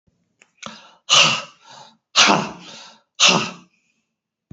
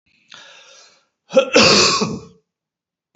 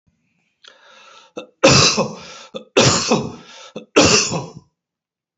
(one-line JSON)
{"exhalation_length": "4.5 s", "exhalation_amplitude": 32768, "exhalation_signal_mean_std_ratio": 0.36, "cough_length": "3.2 s", "cough_amplitude": 30292, "cough_signal_mean_std_ratio": 0.39, "three_cough_length": "5.4 s", "three_cough_amplitude": 32577, "three_cough_signal_mean_std_ratio": 0.42, "survey_phase": "beta (2021-08-13 to 2022-03-07)", "age": "45-64", "gender": "Male", "wearing_mask": "No", "symptom_fatigue": true, "symptom_onset": "12 days", "smoker_status": "Never smoked", "respiratory_condition_asthma": true, "respiratory_condition_other": false, "recruitment_source": "REACT", "submission_delay": "1 day", "covid_test_result": "Negative", "covid_test_method": "RT-qPCR", "covid_ct_value": 47.0, "covid_ct_gene": "N gene"}